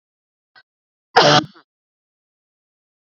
{"cough_length": "3.1 s", "cough_amplitude": 29624, "cough_signal_mean_std_ratio": 0.23, "survey_phase": "beta (2021-08-13 to 2022-03-07)", "age": "45-64", "gender": "Female", "wearing_mask": "No", "symptom_none": true, "smoker_status": "Ex-smoker", "respiratory_condition_asthma": true, "respiratory_condition_other": false, "recruitment_source": "REACT", "submission_delay": "3 days", "covid_test_result": "Negative", "covid_test_method": "RT-qPCR", "influenza_a_test_result": "Negative", "influenza_b_test_result": "Negative"}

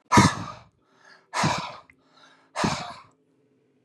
{"exhalation_length": "3.8 s", "exhalation_amplitude": 24805, "exhalation_signal_mean_std_ratio": 0.35, "survey_phase": "beta (2021-08-13 to 2022-03-07)", "age": "45-64", "gender": "Male", "wearing_mask": "No", "symptom_cough_any": true, "symptom_runny_or_blocked_nose": true, "smoker_status": "Never smoked", "respiratory_condition_asthma": false, "respiratory_condition_other": false, "recruitment_source": "REACT", "submission_delay": "14 days", "covid_test_result": "Negative", "covid_test_method": "RT-qPCR", "influenza_a_test_result": "Negative", "influenza_b_test_result": "Negative"}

